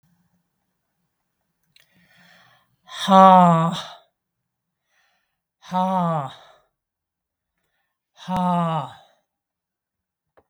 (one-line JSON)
{"exhalation_length": "10.5 s", "exhalation_amplitude": 32768, "exhalation_signal_mean_std_ratio": 0.31, "survey_phase": "beta (2021-08-13 to 2022-03-07)", "age": "65+", "gender": "Female", "wearing_mask": "No", "symptom_none": true, "smoker_status": "Never smoked", "respiratory_condition_asthma": false, "respiratory_condition_other": false, "recruitment_source": "REACT", "submission_delay": "3 days", "covid_test_result": "Negative", "covid_test_method": "RT-qPCR", "influenza_a_test_result": "Negative", "influenza_b_test_result": "Negative"}